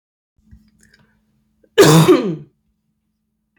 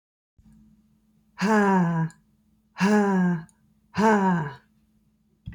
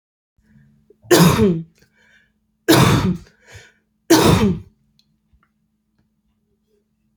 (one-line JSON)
{"cough_length": "3.6 s", "cough_amplitude": 30242, "cough_signal_mean_std_ratio": 0.32, "exhalation_length": "5.5 s", "exhalation_amplitude": 11922, "exhalation_signal_mean_std_ratio": 0.54, "three_cough_length": "7.2 s", "three_cough_amplitude": 31896, "three_cough_signal_mean_std_ratio": 0.37, "survey_phase": "beta (2021-08-13 to 2022-03-07)", "age": "18-44", "gender": "Female", "wearing_mask": "No", "symptom_none": true, "smoker_status": "Never smoked", "respiratory_condition_asthma": false, "respiratory_condition_other": false, "recruitment_source": "REACT", "submission_delay": "1 day", "covid_test_result": "Negative", "covid_test_method": "RT-qPCR", "influenza_a_test_result": "Negative", "influenza_b_test_result": "Negative"}